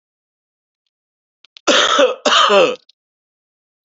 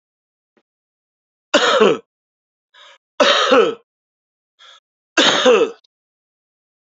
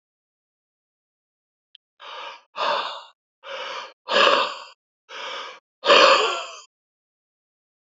{"cough_length": "3.8 s", "cough_amplitude": 30538, "cough_signal_mean_std_ratio": 0.42, "three_cough_length": "6.9 s", "three_cough_amplitude": 31118, "three_cough_signal_mean_std_ratio": 0.38, "exhalation_length": "7.9 s", "exhalation_amplitude": 27140, "exhalation_signal_mean_std_ratio": 0.35, "survey_phase": "beta (2021-08-13 to 2022-03-07)", "age": "65+", "gender": "Male", "wearing_mask": "No", "symptom_none": true, "symptom_onset": "5 days", "smoker_status": "Never smoked", "respiratory_condition_asthma": false, "respiratory_condition_other": false, "recruitment_source": "Test and Trace", "submission_delay": "1 day", "covid_test_result": "Positive", "covid_test_method": "RT-qPCR", "covid_ct_value": 29.1, "covid_ct_gene": "ORF1ab gene"}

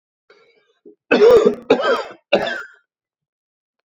{"three_cough_length": "3.8 s", "three_cough_amplitude": 28048, "three_cough_signal_mean_std_ratio": 0.4, "survey_phase": "alpha (2021-03-01 to 2021-08-12)", "age": "18-44", "gender": "Male", "wearing_mask": "No", "symptom_cough_any": true, "symptom_diarrhoea": true, "symptom_fatigue": true, "symptom_fever_high_temperature": true, "symptom_headache": true, "symptom_change_to_sense_of_smell_or_taste": true, "symptom_loss_of_taste": true, "symptom_onset": "4 days", "smoker_status": "Never smoked", "respiratory_condition_asthma": false, "respiratory_condition_other": false, "recruitment_source": "Test and Trace", "submission_delay": "2 days", "covid_test_result": "Positive", "covid_test_method": "RT-qPCR", "covid_ct_value": 20.0, "covid_ct_gene": "N gene"}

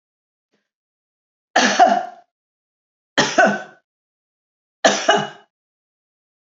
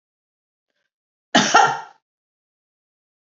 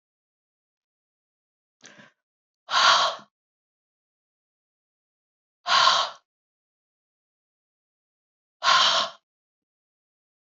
{"three_cough_length": "6.6 s", "three_cough_amplitude": 31048, "three_cough_signal_mean_std_ratio": 0.33, "cough_length": "3.3 s", "cough_amplitude": 30039, "cough_signal_mean_std_ratio": 0.26, "exhalation_length": "10.6 s", "exhalation_amplitude": 19471, "exhalation_signal_mean_std_ratio": 0.28, "survey_phase": "beta (2021-08-13 to 2022-03-07)", "age": "65+", "gender": "Female", "wearing_mask": "No", "symptom_none": true, "smoker_status": "Ex-smoker", "respiratory_condition_asthma": false, "respiratory_condition_other": false, "recruitment_source": "REACT", "submission_delay": "1 day", "covid_test_result": "Negative", "covid_test_method": "RT-qPCR", "covid_ct_value": 39.0, "covid_ct_gene": "E gene", "influenza_a_test_result": "Negative", "influenza_b_test_result": "Negative"}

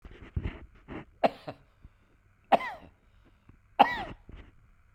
{"three_cough_length": "4.9 s", "three_cough_amplitude": 18525, "three_cough_signal_mean_std_ratio": 0.26, "survey_phase": "beta (2021-08-13 to 2022-03-07)", "age": "45-64", "gender": "Male", "wearing_mask": "No", "symptom_none": true, "smoker_status": "Ex-smoker", "respiratory_condition_asthma": true, "respiratory_condition_other": false, "recruitment_source": "REACT", "submission_delay": "1 day", "covid_test_result": "Negative", "covid_test_method": "RT-qPCR", "influenza_a_test_result": "Negative", "influenza_b_test_result": "Negative"}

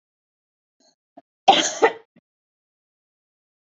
{"cough_length": "3.8 s", "cough_amplitude": 27913, "cough_signal_mean_std_ratio": 0.21, "survey_phase": "beta (2021-08-13 to 2022-03-07)", "age": "45-64", "gender": "Female", "wearing_mask": "No", "symptom_none": true, "smoker_status": "Never smoked", "respiratory_condition_asthma": false, "respiratory_condition_other": false, "recruitment_source": "REACT", "submission_delay": "1 day", "covid_test_result": "Negative", "covid_test_method": "RT-qPCR", "influenza_a_test_result": "Negative", "influenza_b_test_result": "Negative"}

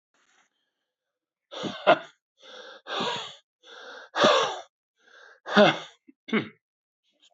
{"exhalation_length": "7.3 s", "exhalation_amplitude": 19785, "exhalation_signal_mean_std_ratio": 0.32, "survey_phase": "beta (2021-08-13 to 2022-03-07)", "age": "65+", "gender": "Male", "wearing_mask": "No", "symptom_none": true, "smoker_status": "Ex-smoker", "respiratory_condition_asthma": false, "respiratory_condition_other": false, "recruitment_source": "REACT", "submission_delay": "1 day", "covid_test_result": "Negative", "covid_test_method": "RT-qPCR"}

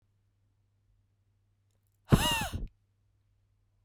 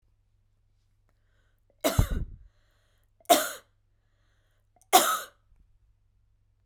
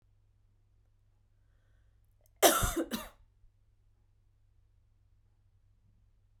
{"exhalation_length": "3.8 s", "exhalation_amplitude": 15313, "exhalation_signal_mean_std_ratio": 0.24, "three_cough_length": "6.7 s", "three_cough_amplitude": 21174, "three_cough_signal_mean_std_ratio": 0.25, "cough_length": "6.4 s", "cough_amplitude": 12932, "cough_signal_mean_std_ratio": 0.21, "survey_phase": "beta (2021-08-13 to 2022-03-07)", "age": "18-44", "gender": "Female", "wearing_mask": "No", "symptom_cough_any": true, "symptom_new_continuous_cough": true, "symptom_shortness_of_breath": true, "symptom_sore_throat": true, "symptom_fatigue": true, "symptom_change_to_sense_of_smell_or_taste": true, "symptom_onset": "3 days", "smoker_status": "Never smoked", "respiratory_condition_asthma": false, "respiratory_condition_other": false, "recruitment_source": "Test and Trace", "submission_delay": "1 day", "covid_test_result": "Positive", "covid_test_method": "ePCR"}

